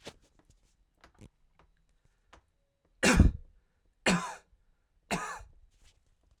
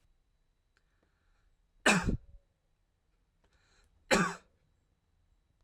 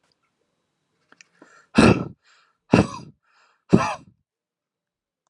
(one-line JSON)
{"three_cough_length": "6.4 s", "three_cough_amplitude": 13662, "three_cough_signal_mean_std_ratio": 0.25, "cough_length": "5.6 s", "cough_amplitude": 9730, "cough_signal_mean_std_ratio": 0.24, "exhalation_length": "5.3 s", "exhalation_amplitude": 32768, "exhalation_signal_mean_std_ratio": 0.24, "survey_phase": "alpha (2021-03-01 to 2021-08-12)", "age": "18-44", "gender": "Male", "wearing_mask": "No", "symptom_fatigue": true, "symptom_onset": "10 days", "smoker_status": "Never smoked", "respiratory_condition_asthma": false, "respiratory_condition_other": false, "recruitment_source": "REACT", "submission_delay": "3 days", "covid_test_result": "Negative", "covid_test_method": "RT-qPCR"}